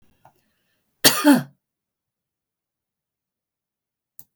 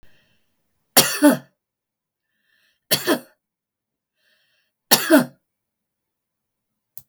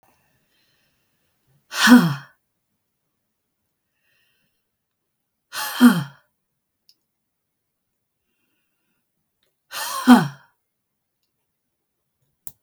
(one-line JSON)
{"cough_length": "4.4 s", "cough_amplitude": 32768, "cough_signal_mean_std_ratio": 0.21, "three_cough_length": "7.1 s", "three_cough_amplitude": 32768, "three_cough_signal_mean_std_ratio": 0.25, "exhalation_length": "12.6 s", "exhalation_amplitude": 32766, "exhalation_signal_mean_std_ratio": 0.21, "survey_phase": "beta (2021-08-13 to 2022-03-07)", "age": "65+", "gender": "Female", "wearing_mask": "No", "symptom_none": true, "smoker_status": "Ex-smoker", "respiratory_condition_asthma": false, "respiratory_condition_other": false, "recruitment_source": "REACT", "submission_delay": "1 day", "covid_test_result": "Negative", "covid_test_method": "RT-qPCR"}